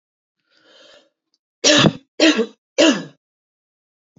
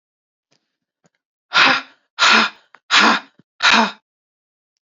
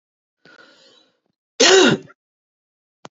three_cough_length: 4.2 s
three_cough_amplitude: 30905
three_cough_signal_mean_std_ratio: 0.34
exhalation_length: 4.9 s
exhalation_amplitude: 32660
exhalation_signal_mean_std_ratio: 0.39
cough_length: 3.2 s
cough_amplitude: 32024
cough_signal_mean_std_ratio: 0.29
survey_phase: beta (2021-08-13 to 2022-03-07)
age: 18-44
gender: Female
wearing_mask: 'No'
symptom_cough_any: true
symptom_runny_or_blocked_nose: true
symptom_sore_throat: true
symptom_fatigue: true
symptom_headache: true
symptom_onset: 3 days
smoker_status: Never smoked
respiratory_condition_asthma: false
respiratory_condition_other: false
recruitment_source: Test and Trace
submission_delay: 2 days
covid_test_result: Positive
covid_test_method: RT-qPCR
covid_ct_value: 16.9
covid_ct_gene: ORF1ab gene
covid_ct_mean: 17.8
covid_viral_load: 1500000 copies/ml
covid_viral_load_category: High viral load (>1M copies/ml)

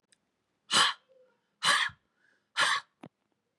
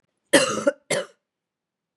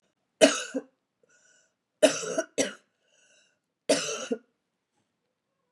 exhalation_length: 3.6 s
exhalation_amplitude: 9561
exhalation_signal_mean_std_ratio: 0.36
cough_length: 2.0 s
cough_amplitude: 25672
cough_signal_mean_std_ratio: 0.35
three_cough_length: 5.7 s
three_cough_amplitude: 24246
three_cough_signal_mean_std_ratio: 0.28
survey_phase: beta (2021-08-13 to 2022-03-07)
age: 45-64
gender: Female
wearing_mask: 'No'
symptom_cough_any: true
symptom_runny_or_blocked_nose: true
symptom_sore_throat: true
symptom_headache: true
smoker_status: Never smoked
respiratory_condition_asthma: false
respiratory_condition_other: false
recruitment_source: Test and Trace
submission_delay: 1 day
covid_test_result: Positive
covid_test_method: ePCR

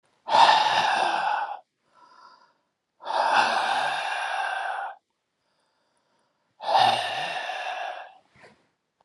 exhalation_length: 9.0 s
exhalation_amplitude: 19522
exhalation_signal_mean_std_ratio: 0.55
survey_phase: beta (2021-08-13 to 2022-03-07)
age: 45-64
gender: Male
wearing_mask: 'No'
symptom_none: true
symptom_onset: 12 days
smoker_status: Never smoked
respiratory_condition_asthma: true
respiratory_condition_other: true
recruitment_source: REACT
submission_delay: 1 day
covid_test_result: Negative
covid_test_method: RT-qPCR
influenza_a_test_result: Negative
influenza_b_test_result: Negative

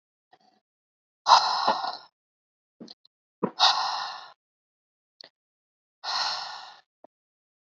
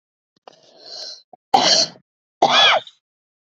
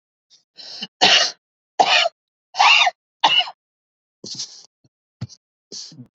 exhalation_length: 7.7 s
exhalation_amplitude: 23300
exhalation_signal_mean_std_ratio: 0.32
cough_length: 3.5 s
cough_amplitude: 28280
cough_signal_mean_std_ratio: 0.39
three_cough_length: 6.1 s
three_cough_amplitude: 28882
three_cough_signal_mean_std_ratio: 0.37
survey_phase: beta (2021-08-13 to 2022-03-07)
age: 45-64
gender: Female
wearing_mask: 'No'
symptom_none: true
smoker_status: Never smoked
respiratory_condition_asthma: false
respiratory_condition_other: false
recruitment_source: REACT
submission_delay: 3 days
covid_test_result: Negative
covid_test_method: RT-qPCR
influenza_a_test_result: Negative
influenza_b_test_result: Negative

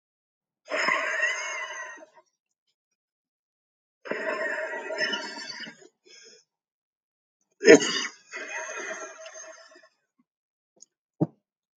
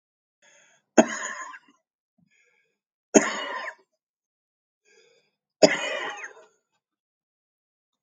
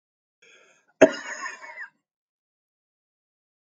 exhalation_length: 11.8 s
exhalation_amplitude: 27518
exhalation_signal_mean_std_ratio: 0.32
three_cough_length: 8.0 s
three_cough_amplitude: 30455
three_cough_signal_mean_std_ratio: 0.22
cough_length: 3.7 s
cough_amplitude: 28541
cough_signal_mean_std_ratio: 0.17
survey_phase: alpha (2021-03-01 to 2021-08-12)
age: 65+
gender: Male
wearing_mask: 'No'
symptom_shortness_of_breath: true
symptom_fatigue: true
symptom_onset: 11 days
smoker_status: Ex-smoker
respiratory_condition_asthma: false
respiratory_condition_other: true
recruitment_source: REACT
submission_delay: 3 days
covid_test_result: Negative
covid_test_method: RT-qPCR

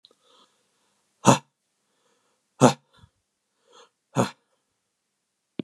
exhalation_length: 5.6 s
exhalation_amplitude: 31494
exhalation_signal_mean_std_ratio: 0.18
survey_phase: beta (2021-08-13 to 2022-03-07)
age: 65+
gender: Male
wearing_mask: 'No'
symptom_none: true
smoker_status: Never smoked
respiratory_condition_asthma: false
respiratory_condition_other: false
recruitment_source: REACT
submission_delay: 0 days
covid_test_result: Negative
covid_test_method: RT-qPCR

